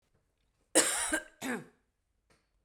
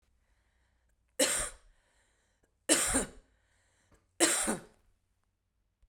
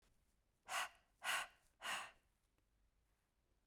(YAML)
cough_length: 2.6 s
cough_amplitude: 9683
cough_signal_mean_std_ratio: 0.35
three_cough_length: 5.9 s
three_cough_amplitude: 12267
three_cough_signal_mean_std_ratio: 0.33
exhalation_length: 3.7 s
exhalation_amplitude: 1019
exhalation_signal_mean_std_ratio: 0.36
survey_phase: beta (2021-08-13 to 2022-03-07)
age: 45-64
gender: Female
wearing_mask: 'No'
symptom_cough_any: true
symptom_sore_throat: true
symptom_fatigue: true
symptom_fever_high_temperature: true
symptom_headache: true
symptom_onset: 4 days
smoker_status: Never smoked
respiratory_condition_asthma: false
respiratory_condition_other: false
recruitment_source: Test and Trace
submission_delay: 2 days
covid_test_result: Positive
covid_test_method: RT-qPCR
covid_ct_value: 23.6
covid_ct_gene: ORF1ab gene
covid_ct_mean: 24.7
covid_viral_load: 7900 copies/ml
covid_viral_load_category: Minimal viral load (< 10K copies/ml)